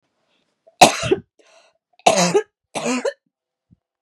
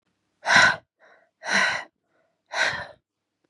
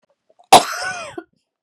{
  "three_cough_length": "4.0 s",
  "three_cough_amplitude": 32768,
  "three_cough_signal_mean_std_ratio": 0.33,
  "exhalation_length": "3.5 s",
  "exhalation_amplitude": 24099,
  "exhalation_signal_mean_std_ratio": 0.39,
  "cough_length": "1.6 s",
  "cough_amplitude": 32768,
  "cough_signal_mean_std_ratio": 0.28,
  "survey_phase": "beta (2021-08-13 to 2022-03-07)",
  "age": "18-44",
  "gender": "Female",
  "wearing_mask": "No",
  "symptom_runny_or_blocked_nose": true,
  "symptom_sore_throat": true,
  "symptom_onset": "13 days",
  "smoker_status": "Never smoked",
  "respiratory_condition_asthma": false,
  "respiratory_condition_other": false,
  "recruitment_source": "REACT",
  "submission_delay": "1 day",
  "covid_test_result": "Negative",
  "covid_test_method": "RT-qPCR"
}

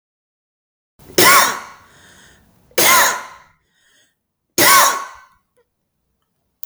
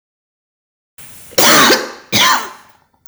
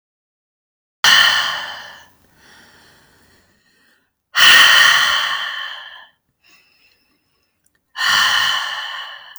{
  "three_cough_length": "6.7 s",
  "three_cough_amplitude": 32768,
  "three_cough_signal_mean_std_ratio": 0.36,
  "cough_length": "3.1 s",
  "cough_amplitude": 32768,
  "cough_signal_mean_std_ratio": 0.47,
  "exhalation_length": "9.4 s",
  "exhalation_amplitude": 32768,
  "exhalation_signal_mean_std_ratio": 0.43,
  "survey_phase": "beta (2021-08-13 to 2022-03-07)",
  "age": "18-44",
  "gender": "Female",
  "wearing_mask": "No",
  "symptom_runny_or_blocked_nose": true,
  "symptom_onset": "12 days",
  "smoker_status": "Never smoked",
  "respiratory_condition_asthma": true,
  "respiratory_condition_other": false,
  "recruitment_source": "REACT",
  "submission_delay": "1 day",
  "covid_test_result": "Positive",
  "covid_test_method": "RT-qPCR",
  "covid_ct_value": 29.0,
  "covid_ct_gene": "E gene"
}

